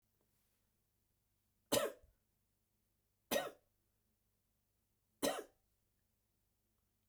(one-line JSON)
{"three_cough_length": "7.1 s", "three_cough_amplitude": 3019, "three_cough_signal_mean_std_ratio": 0.22, "survey_phase": "beta (2021-08-13 to 2022-03-07)", "age": "18-44", "gender": "Male", "wearing_mask": "No", "symptom_none": true, "smoker_status": "Never smoked", "respiratory_condition_asthma": false, "respiratory_condition_other": false, "recruitment_source": "REACT", "submission_delay": "0 days", "covid_test_result": "Negative", "covid_test_method": "RT-qPCR"}